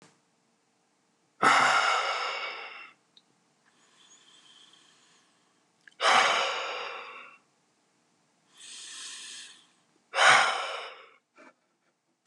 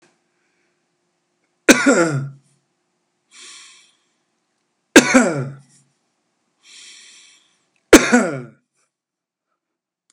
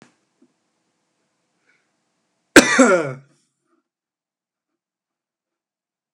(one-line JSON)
{"exhalation_length": "12.3 s", "exhalation_amplitude": 17172, "exhalation_signal_mean_std_ratio": 0.37, "three_cough_length": "10.1 s", "three_cough_amplitude": 32768, "three_cough_signal_mean_std_ratio": 0.26, "cough_length": "6.1 s", "cough_amplitude": 32768, "cough_signal_mean_std_ratio": 0.2, "survey_phase": "beta (2021-08-13 to 2022-03-07)", "age": "65+", "gender": "Male", "wearing_mask": "No", "symptom_none": true, "smoker_status": "Current smoker (e-cigarettes or vapes only)", "respiratory_condition_asthma": false, "respiratory_condition_other": false, "recruitment_source": "REACT", "submission_delay": "2 days", "covid_test_result": "Negative", "covid_test_method": "RT-qPCR"}